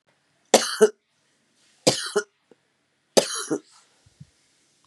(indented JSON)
{
  "three_cough_length": "4.9 s",
  "three_cough_amplitude": 32767,
  "three_cough_signal_mean_std_ratio": 0.27,
  "survey_phase": "beta (2021-08-13 to 2022-03-07)",
  "age": "65+",
  "gender": "Female",
  "wearing_mask": "No",
  "symptom_cough_any": true,
  "symptom_runny_or_blocked_nose": true,
  "symptom_sore_throat": true,
  "smoker_status": "Ex-smoker",
  "respiratory_condition_asthma": false,
  "respiratory_condition_other": false,
  "recruitment_source": "Test and Trace",
  "submission_delay": "2 days",
  "covid_test_result": "Positive",
  "covid_test_method": "RT-qPCR"
}